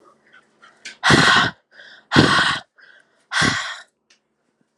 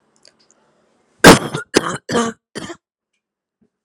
{"exhalation_length": "4.8 s", "exhalation_amplitude": 32639, "exhalation_signal_mean_std_ratio": 0.42, "cough_length": "3.8 s", "cough_amplitude": 32768, "cough_signal_mean_std_ratio": 0.26, "survey_phase": "alpha (2021-03-01 to 2021-08-12)", "age": "18-44", "gender": "Female", "wearing_mask": "No", "symptom_cough_any": true, "symptom_diarrhoea": true, "symptom_fatigue": true, "symptom_change_to_sense_of_smell_or_taste": true, "symptom_onset": "6 days", "smoker_status": "Never smoked", "respiratory_condition_asthma": false, "respiratory_condition_other": false, "recruitment_source": "Test and Trace", "submission_delay": "2 days", "covid_test_result": "Positive", "covid_test_method": "RT-qPCR", "covid_ct_value": 17.2, "covid_ct_gene": "N gene", "covid_ct_mean": 17.2, "covid_viral_load": "2300000 copies/ml", "covid_viral_load_category": "High viral load (>1M copies/ml)"}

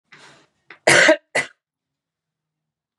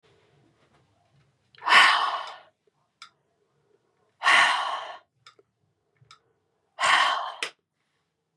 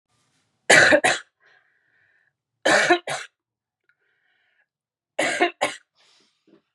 {"cough_length": "3.0 s", "cough_amplitude": 32136, "cough_signal_mean_std_ratio": 0.28, "exhalation_length": "8.4 s", "exhalation_amplitude": 21157, "exhalation_signal_mean_std_ratio": 0.34, "three_cough_length": "6.7 s", "three_cough_amplitude": 29945, "three_cough_signal_mean_std_ratio": 0.32, "survey_phase": "beta (2021-08-13 to 2022-03-07)", "age": "18-44", "gender": "Female", "wearing_mask": "Yes", "symptom_cough_any": true, "symptom_new_continuous_cough": true, "symptom_sore_throat": true, "symptom_headache": true, "symptom_onset": "5 days", "smoker_status": "Ex-smoker", "respiratory_condition_asthma": false, "respiratory_condition_other": false, "recruitment_source": "Test and Trace", "submission_delay": "2 days", "covid_test_result": "Positive", "covid_test_method": "RT-qPCR", "covid_ct_value": 20.1, "covid_ct_gene": "ORF1ab gene"}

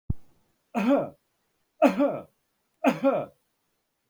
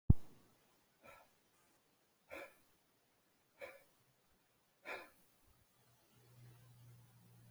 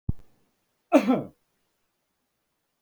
{"three_cough_length": "4.1 s", "three_cough_amplitude": 16753, "three_cough_signal_mean_std_ratio": 0.42, "exhalation_length": "7.5 s", "exhalation_amplitude": 6932, "exhalation_signal_mean_std_ratio": 0.17, "cough_length": "2.8 s", "cough_amplitude": 16274, "cough_signal_mean_std_ratio": 0.26, "survey_phase": "beta (2021-08-13 to 2022-03-07)", "age": "65+", "gender": "Male", "wearing_mask": "No", "symptom_none": true, "smoker_status": "Never smoked", "respiratory_condition_asthma": false, "respiratory_condition_other": false, "recruitment_source": "REACT", "submission_delay": "2 days", "covid_test_result": "Negative", "covid_test_method": "RT-qPCR"}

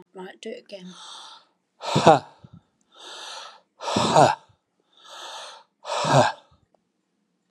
{"exhalation_length": "7.5 s", "exhalation_amplitude": 30483, "exhalation_signal_mean_std_ratio": 0.33, "survey_phase": "beta (2021-08-13 to 2022-03-07)", "age": "65+", "gender": "Male", "wearing_mask": "No", "symptom_none": true, "smoker_status": "Never smoked", "respiratory_condition_asthma": false, "respiratory_condition_other": false, "recruitment_source": "REACT", "submission_delay": "3 days", "covid_test_result": "Negative", "covid_test_method": "RT-qPCR", "influenza_a_test_result": "Negative", "influenza_b_test_result": "Negative"}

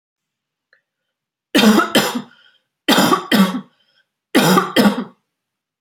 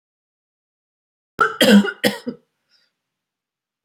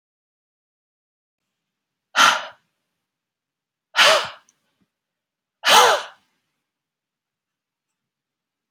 {"three_cough_length": "5.8 s", "three_cough_amplitude": 32768, "three_cough_signal_mean_std_ratio": 0.46, "cough_length": "3.8 s", "cough_amplitude": 28045, "cough_signal_mean_std_ratio": 0.28, "exhalation_length": "8.7 s", "exhalation_amplitude": 31045, "exhalation_signal_mean_std_ratio": 0.25, "survey_phase": "beta (2021-08-13 to 2022-03-07)", "age": "45-64", "gender": "Female", "wearing_mask": "No", "symptom_none": true, "smoker_status": "Ex-smoker", "respiratory_condition_asthma": false, "respiratory_condition_other": false, "recruitment_source": "REACT", "submission_delay": "2 days", "covid_test_result": "Negative", "covid_test_method": "RT-qPCR"}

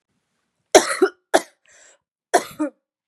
{"three_cough_length": "3.1 s", "three_cough_amplitude": 32768, "three_cough_signal_mean_std_ratio": 0.27, "survey_phase": "beta (2021-08-13 to 2022-03-07)", "age": "18-44", "gender": "Female", "wearing_mask": "No", "symptom_cough_any": true, "symptom_runny_or_blocked_nose": true, "symptom_shortness_of_breath": true, "symptom_sore_throat": true, "symptom_change_to_sense_of_smell_or_taste": true, "smoker_status": "Never smoked", "respiratory_condition_asthma": false, "respiratory_condition_other": false, "recruitment_source": "Test and Trace", "submission_delay": "1 day", "covid_test_result": "Positive", "covid_test_method": "LFT"}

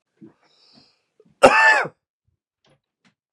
{"cough_length": "3.3 s", "cough_amplitude": 32768, "cough_signal_mean_std_ratio": 0.27, "survey_phase": "beta (2021-08-13 to 2022-03-07)", "age": "18-44", "gender": "Male", "wearing_mask": "No", "symptom_fatigue": true, "symptom_headache": true, "symptom_other": true, "symptom_onset": "4 days", "smoker_status": "Never smoked", "respiratory_condition_asthma": false, "respiratory_condition_other": false, "recruitment_source": "Test and Trace", "submission_delay": "2 days", "covid_test_result": "Positive", "covid_test_method": "RT-qPCR", "covid_ct_value": 19.1, "covid_ct_gene": "ORF1ab gene", "covid_ct_mean": 19.5, "covid_viral_load": "410000 copies/ml", "covid_viral_load_category": "Low viral load (10K-1M copies/ml)"}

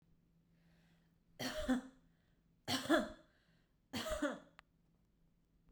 {"three_cough_length": "5.7 s", "three_cough_amplitude": 3791, "three_cough_signal_mean_std_ratio": 0.36, "survey_phase": "beta (2021-08-13 to 2022-03-07)", "age": "18-44", "gender": "Female", "wearing_mask": "No", "symptom_none": true, "smoker_status": "Never smoked", "respiratory_condition_asthma": true, "respiratory_condition_other": false, "recruitment_source": "REACT", "submission_delay": "1 day", "covid_test_result": "Negative", "covid_test_method": "RT-qPCR"}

